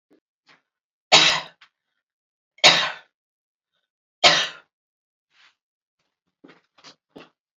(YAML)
three_cough_length: 7.6 s
three_cough_amplitude: 30763
three_cough_signal_mean_std_ratio: 0.24
survey_phase: beta (2021-08-13 to 2022-03-07)
age: 45-64
gender: Female
wearing_mask: 'No'
symptom_none: true
smoker_status: Never smoked
respiratory_condition_asthma: false
respiratory_condition_other: false
recruitment_source: REACT
submission_delay: 0 days
covid_test_result: Negative
covid_test_method: RT-qPCR